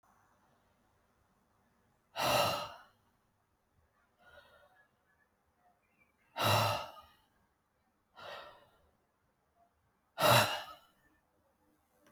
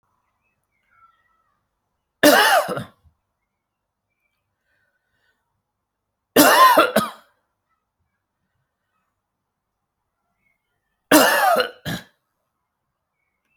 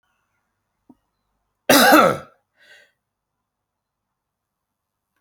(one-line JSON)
{"exhalation_length": "12.1 s", "exhalation_amplitude": 7118, "exhalation_signal_mean_std_ratio": 0.28, "three_cough_length": "13.6 s", "three_cough_amplitude": 32768, "three_cough_signal_mean_std_ratio": 0.28, "cough_length": "5.2 s", "cough_amplitude": 30314, "cough_signal_mean_std_ratio": 0.24, "survey_phase": "alpha (2021-03-01 to 2021-08-12)", "age": "45-64", "gender": "Male", "wearing_mask": "No", "symptom_none": true, "smoker_status": "Never smoked", "respiratory_condition_asthma": false, "respiratory_condition_other": false, "recruitment_source": "REACT", "submission_delay": "1 day", "covid_test_result": "Negative", "covid_test_method": "RT-qPCR"}